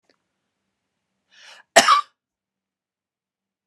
{"cough_length": "3.7 s", "cough_amplitude": 32768, "cough_signal_mean_std_ratio": 0.2, "survey_phase": "beta (2021-08-13 to 2022-03-07)", "age": "45-64", "gender": "Female", "wearing_mask": "No", "symptom_none": true, "smoker_status": "Never smoked", "respiratory_condition_asthma": true, "respiratory_condition_other": false, "recruitment_source": "REACT", "submission_delay": "1 day", "covid_test_result": "Negative", "covid_test_method": "RT-qPCR"}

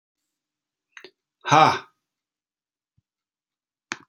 {"exhalation_length": "4.1 s", "exhalation_amplitude": 27638, "exhalation_signal_mean_std_ratio": 0.2, "survey_phase": "alpha (2021-03-01 to 2021-08-12)", "age": "45-64", "gender": "Male", "wearing_mask": "No", "symptom_none": true, "smoker_status": "Never smoked", "respiratory_condition_asthma": false, "respiratory_condition_other": false, "recruitment_source": "REACT", "submission_delay": "3 days", "covid_test_result": "Negative", "covid_test_method": "RT-qPCR"}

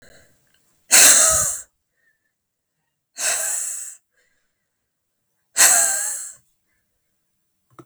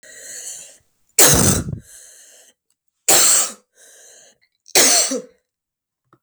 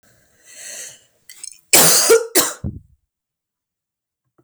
{"exhalation_length": "7.9 s", "exhalation_amplitude": 32768, "exhalation_signal_mean_std_ratio": 0.35, "three_cough_length": "6.2 s", "three_cough_amplitude": 32768, "three_cough_signal_mean_std_ratio": 0.4, "cough_length": "4.4 s", "cough_amplitude": 32768, "cough_signal_mean_std_ratio": 0.35, "survey_phase": "beta (2021-08-13 to 2022-03-07)", "age": "18-44", "gender": "Female", "wearing_mask": "No", "symptom_runny_or_blocked_nose": true, "symptom_shortness_of_breath": true, "symptom_fatigue": true, "symptom_headache": true, "symptom_onset": "5 days", "smoker_status": "Never smoked", "respiratory_condition_asthma": false, "respiratory_condition_other": false, "recruitment_source": "Test and Trace", "submission_delay": "2 days", "covid_test_result": "Positive", "covid_test_method": "RT-qPCR", "covid_ct_value": 18.7, "covid_ct_gene": "ORF1ab gene", "covid_ct_mean": 19.1, "covid_viral_load": "540000 copies/ml", "covid_viral_load_category": "Low viral load (10K-1M copies/ml)"}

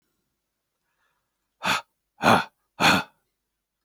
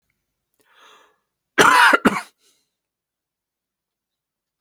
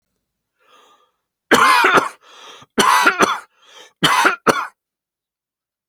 {"exhalation_length": "3.8 s", "exhalation_amplitude": 22876, "exhalation_signal_mean_std_ratio": 0.3, "cough_length": "4.6 s", "cough_amplitude": 32767, "cough_signal_mean_std_ratio": 0.26, "three_cough_length": "5.9 s", "three_cough_amplitude": 32767, "three_cough_signal_mean_std_ratio": 0.43, "survey_phase": "beta (2021-08-13 to 2022-03-07)", "age": "65+", "gender": "Male", "wearing_mask": "No", "symptom_none": true, "smoker_status": "Ex-smoker", "respiratory_condition_asthma": false, "respiratory_condition_other": false, "recruitment_source": "REACT", "submission_delay": "2 days", "covid_test_result": "Negative", "covid_test_method": "RT-qPCR"}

